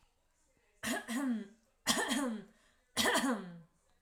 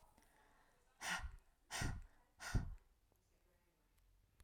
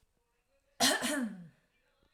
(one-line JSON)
{"three_cough_length": "4.0 s", "three_cough_amplitude": 5579, "three_cough_signal_mean_std_ratio": 0.56, "exhalation_length": "4.4 s", "exhalation_amplitude": 1488, "exhalation_signal_mean_std_ratio": 0.38, "cough_length": "2.1 s", "cough_amplitude": 6340, "cough_signal_mean_std_ratio": 0.41, "survey_phase": "alpha (2021-03-01 to 2021-08-12)", "age": "18-44", "gender": "Female", "wearing_mask": "No", "symptom_none": true, "smoker_status": "Never smoked", "respiratory_condition_asthma": false, "respiratory_condition_other": false, "recruitment_source": "REACT", "submission_delay": "1 day", "covid_test_result": "Negative", "covid_test_method": "RT-qPCR", "covid_ct_value": 42.0, "covid_ct_gene": "N gene"}